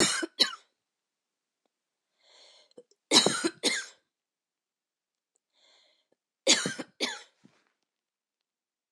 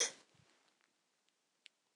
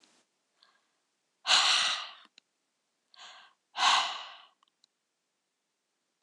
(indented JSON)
{
  "three_cough_length": "8.9 s",
  "three_cough_amplitude": 18667,
  "three_cough_signal_mean_std_ratio": 0.27,
  "cough_length": "2.0 s",
  "cough_amplitude": 2714,
  "cough_signal_mean_std_ratio": 0.19,
  "exhalation_length": "6.2 s",
  "exhalation_amplitude": 10924,
  "exhalation_signal_mean_std_ratio": 0.32,
  "survey_phase": "alpha (2021-03-01 to 2021-08-12)",
  "age": "45-64",
  "gender": "Female",
  "wearing_mask": "No",
  "symptom_none": true,
  "smoker_status": "Never smoked",
  "respiratory_condition_asthma": false,
  "respiratory_condition_other": false,
  "recruitment_source": "REACT",
  "submission_delay": "2 days",
  "covid_test_result": "Negative",
  "covid_test_method": "RT-qPCR"
}